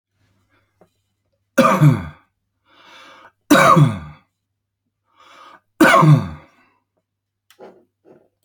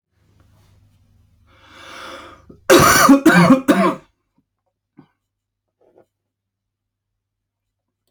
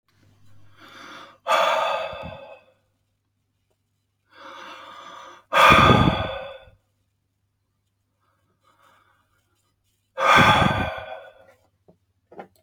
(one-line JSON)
{"three_cough_length": "8.4 s", "three_cough_amplitude": 32767, "three_cough_signal_mean_std_ratio": 0.33, "cough_length": "8.1 s", "cough_amplitude": 32767, "cough_signal_mean_std_ratio": 0.31, "exhalation_length": "12.6 s", "exhalation_amplitude": 25877, "exhalation_signal_mean_std_ratio": 0.34, "survey_phase": "beta (2021-08-13 to 2022-03-07)", "age": "18-44", "gender": "Male", "wearing_mask": "No", "symptom_none": true, "smoker_status": "Ex-smoker", "respiratory_condition_asthma": false, "respiratory_condition_other": false, "recruitment_source": "REACT", "submission_delay": "1 day", "covid_test_result": "Negative", "covid_test_method": "RT-qPCR"}